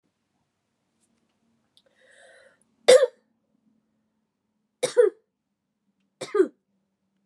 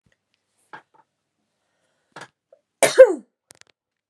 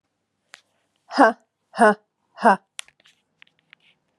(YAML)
three_cough_length: 7.3 s
three_cough_amplitude: 28907
three_cough_signal_mean_std_ratio: 0.2
cough_length: 4.1 s
cough_amplitude: 32768
cough_signal_mean_std_ratio: 0.17
exhalation_length: 4.2 s
exhalation_amplitude: 30927
exhalation_signal_mean_std_ratio: 0.25
survey_phase: beta (2021-08-13 to 2022-03-07)
age: 45-64
gender: Female
wearing_mask: 'No'
symptom_runny_or_blocked_nose: true
symptom_other: true
symptom_onset: 4 days
smoker_status: Never smoked
respiratory_condition_asthma: false
respiratory_condition_other: false
recruitment_source: Test and Trace
submission_delay: 3 days
covid_test_result: Positive
covid_test_method: RT-qPCR
covid_ct_value: 16.3
covid_ct_gene: ORF1ab gene
covid_ct_mean: 16.7
covid_viral_load: 3400000 copies/ml
covid_viral_load_category: High viral load (>1M copies/ml)